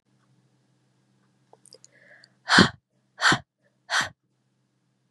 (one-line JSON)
{"exhalation_length": "5.1 s", "exhalation_amplitude": 28975, "exhalation_signal_mean_std_ratio": 0.23, "survey_phase": "beta (2021-08-13 to 2022-03-07)", "age": "18-44", "gender": "Female", "wearing_mask": "No", "symptom_cough_any": true, "symptom_onset": "9 days", "smoker_status": "Never smoked", "respiratory_condition_asthma": false, "respiratory_condition_other": false, "recruitment_source": "REACT", "submission_delay": "2 days", "covid_test_result": "Negative", "covid_test_method": "RT-qPCR", "influenza_a_test_result": "Negative", "influenza_b_test_result": "Negative"}